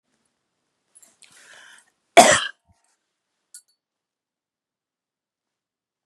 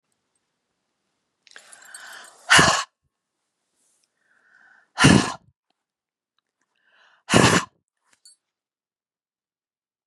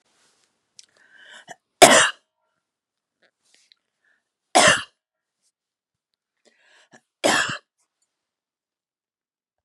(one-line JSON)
{"cough_length": "6.1 s", "cough_amplitude": 32768, "cough_signal_mean_std_ratio": 0.15, "exhalation_length": "10.1 s", "exhalation_amplitude": 31578, "exhalation_signal_mean_std_ratio": 0.24, "three_cough_length": "9.6 s", "three_cough_amplitude": 32768, "three_cough_signal_mean_std_ratio": 0.21, "survey_phase": "beta (2021-08-13 to 2022-03-07)", "age": "65+", "gender": "Female", "wearing_mask": "No", "symptom_none": true, "smoker_status": "Ex-smoker", "respiratory_condition_asthma": false, "respiratory_condition_other": false, "recruitment_source": "REACT", "submission_delay": "1 day", "covid_test_result": "Negative", "covid_test_method": "RT-qPCR", "influenza_a_test_result": "Negative", "influenza_b_test_result": "Negative"}